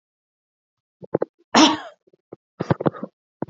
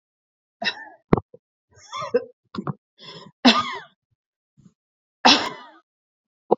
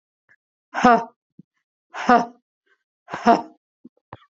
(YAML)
cough_length: 3.5 s
cough_amplitude: 28058
cough_signal_mean_std_ratio: 0.27
three_cough_length: 6.6 s
three_cough_amplitude: 32767
three_cough_signal_mean_std_ratio: 0.27
exhalation_length: 4.4 s
exhalation_amplitude: 27734
exhalation_signal_mean_std_ratio: 0.28
survey_phase: beta (2021-08-13 to 2022-03-07)
age: 18-44
gender: Female
wearing_mask: 'No'
symptom_runny_or_blocked_nose: true
symptom_shortness_of_breath: true
symptom_fatigue: true
symptom_onset: 12 days
smoker_status: Ex-smoker
respiratory_condition_asthma: false
respiratory_condition_other: false
recruitment_source: REACT
submission_delay: 1 day
covid_test_result: Negative
covid_test_method: RT-qPCR
influenza_a_test_result: Negative
influenza_b_test_result: Negative